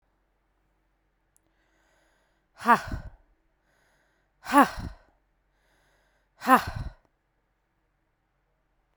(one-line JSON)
{"exhalation_length": "9.0 s", "exhalation_amplitude": 20976, "exhalation_signal_mean_std_ratio": 0.2, "survey_phase": "beta (2021-08-13 to 2022-03-07)", "age": "18-44", "gender": "Female", "wearing_mask": "No", "symptom_cough_any": true, "symptom_runny_or_blocked_nose": true, "symptom_sore_throat": true, "symptom_abdominal_pain": true, "symptom_diarrhoea": true, "symptom_headache": true, "symptom_other": true, "symptom_onset": "2 days", "smoker_status": "Prefer not to say", "respiratory_condition_asthma": false, "respiratory_condition_other": false, "recruitment_source": "Test and Trace", "submission_delay": "1 day", "covid_test_result": "Positive", "covid_test_method": "RT-qPCR"}